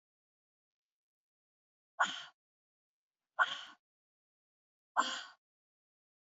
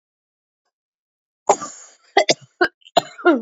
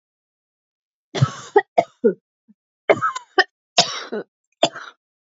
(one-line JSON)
{"exhalation_length": "6.2 s", "exhalation_amplitude": 4930, "exhalation_signal_mean_std_ratio": 0.21, "cough_length": "3.4 s", "cough_amplitude": 30449, "cough_signal_mean_std_ratio": 0.3, "three_cough_length": "5.4 s", "three_cough_amplitude": 31728, "three_cough_signal_mean_std_ratio": 0.3, "survey_phase": "beta (2021-08-13 to 2022-03-07)", "age": "45-64", "gender": "Female", "wearing_mask": "No", "symptom_cough_any": true, "symptom_runny_or_blocked_nose": true, "symptom_sore_throat": true, "symptom_fatigue": true, "symptom_change_to_sense_of_smell_or_taste": true, "symptom_loss_of_taste": true, "symptom_other": true, "symptom_onset": "2 days", "smoker_status": "Never smoked", "respiratory_condition_asthma": false, "respiratory_condition_other": false, "recruitment_source": "Test and Trace", "submission_delay": "1 day", "covid_test_result": "Positive", "covid_test_method": "RT-qPCR", "covid_ct_value": 29.0, "covid_ct_gene": "N gene"}